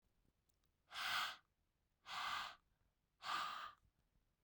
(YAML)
exhalation_length: 4.4 s
exhalation_amplitude: 1220
exhalation_signal_mean_std_ratio: 0.47
survey_phase: beta (2021-08-13 to 2022-03-07)
age: 18-44
gender: Female
wearing_mask: 'No'
symptom_cough_any: true
symptom_runny_or_blocked_nose: true
symptom_shortness_of_breath: true
symptom_sore_throat: true
symptom_diarrhoea: true
symptom_fatigue: true
symptom_fever_high_temperature: true
symptom_headache: true
symptom_change_to_sense_of_smell_or_taste: true
symptom_loss_of_taste: true
symptom_other: true
symptom_onset: 2 days
smoker_status: Never smoked
respiratory_condition_asthma: true
respiratory_condition_other: false
recruitment_source: Test and Trace
submission_delay: 2 days
covid_test_result: Positive
covid_test_method: RT-qPCR
covid_ct_value: 24.7
covid_ct_gene: S gene
covid_ct_mean: 25.2
covid_viral_load: 5500 copies/ml
covid_viral_load_category: Minimal viral load (< 10K copies/ml)